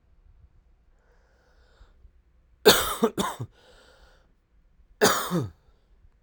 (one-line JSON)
{"cough_length": "6.2 s", "cough_amplitude": 27205, "cough_signal_mean_std_ratio": 0.29, "survey_phase": "alpha (2021-03-01 to 2021-08-12)", "age": "18-44", "gender": "Male", "wearing_mask": "No", "symptom_cough_any": true, "symptom_shortness_of_breath": true, "symptom_fatigue": true, "symptom_fever_high_temperature": true, "symptom_change_to_sense_of_smell_or_taste": true, "symptom_onset": "5 days", "smoker_status": "Ex-smoker", "respiratory_condition_asthma": true, "respiratory_condition_other": false, "recruitment_source": "Test and Trace", "submission_delay": "2 days", "covid_test_result": "Positive", "covid_test_method": "RT-qPCR", "covid_ct_value": 26.9, "covid_ct_gene": "N gene"}